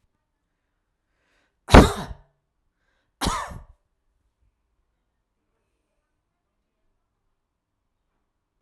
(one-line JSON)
{"cough_length": "8.6 s", "cough_amplitude": 32768, "cough_signal_mean_std_ratio": 0.14, "survey_phase": "alpha (2021-03-01 to 2021-08-12)", "age": "45-64", "gender": "Female", "wearing_mask": "No", "symptom_none": true, "smoker_status": "Ex-smoker", "respiratory_condition_asthma": true, "respiratory_condition_other": false, "recruitment_source": "REACT", "submission_delay": "5 days", "covid_test_result": "Negative", "covid_test_method": "RT-qPCR"}